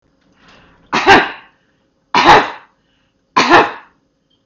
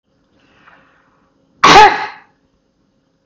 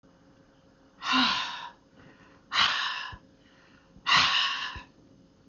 {
  "three_cough_length": "4.5 s",
  "three_cough_amplitude": 32768,
  "three_cough_signal_mean_std_ratio": 0.38,
  "cough_length": "3.3 s",
  "cough_amplitude": 32768,
  "cough_signal_mean_std_ratio": 0.29,
  "exhalation_length": "5.5 s",
  "exhalation_amplitude": 12616,
  "exhalation_signal_mean_std_ratio": 0.47,
  "survey_phase": "beta (2021-08-13 to 2022-03-07)",
  "age": "65+",
  "gender": "Female",
  "wearing_mask": "No",
  "symptom_none": true,
  "smoker_status": "Never smoked",
  "respiratory_condition_asthma": false,
  "respiratory_condition_other": false,
  "recruitment_source": "REACT",
  "submission_delay": "0 days",
  "covid_test_result": "Negative",
  "covid_test_method": "RT-qPCR",
  "influenza_a_test_result": "Negative",
  "influenza_b_test_result": "Negative"
}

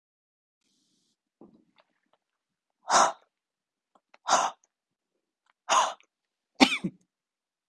{
  "exhalation_length": "7.7 s",
  "exhalation_amplitude": 28295,
  "exhalation_signal_mean_std_ratio": 0.25,
  "survey_phase": "beta (2021-08-13 to 2022-03-07)",
  "age": "45-64",
  "gender": "Female",
  "wearing_mask": "No",
  "symptom_cough_any": true,
  "symptom_new_continuous_cough": true,
  "symptom_runny_or_blocked_nose": true,
  "symptom_sore_throat": true,
  "symptom_onset": "7 days",
  "smoker_status": "Ex-smoker",
  "respiratory_condition_asthma": false,
  "respiratory_condition_other": false,
  "recruitment_source": "Test and Trace",
  "submission_delay": "2 days",
  "covid_test_result": "Positive",
  "covid_test_method": "RT-qPCR",
  "covid_ct_value": 24.1,
  "covid_ct_gene": "N gene"
}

